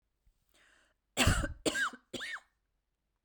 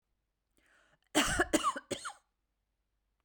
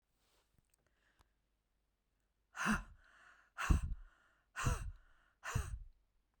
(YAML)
three_cough_length: 3.2 s
three_cough_amplitude: 6561
three_cough_signal_mean_std_ratio: 0.37
cough_length: 3.2 s
cough_amplitude: 6591
cough_signal_mean_std_ratio: 0.34
exhalation_length: 6.4 s
exhalation_amplitude: 4172
exhalation_signal_mean_std_ratio: 0.34
survey_phase: beta (2021-08-13 to 2022-03-07)
age: 45-64
gender: Female
wearing_mask: 'No'
symptom_none: true
smoker_status: Never smoked
respiratory_condition_asthma: false
respiratory_condition_other: false
recruitment_source: REACT
submission_delay: 2 days
covid_test_result: Negative
covid_test_method: RT-qPCR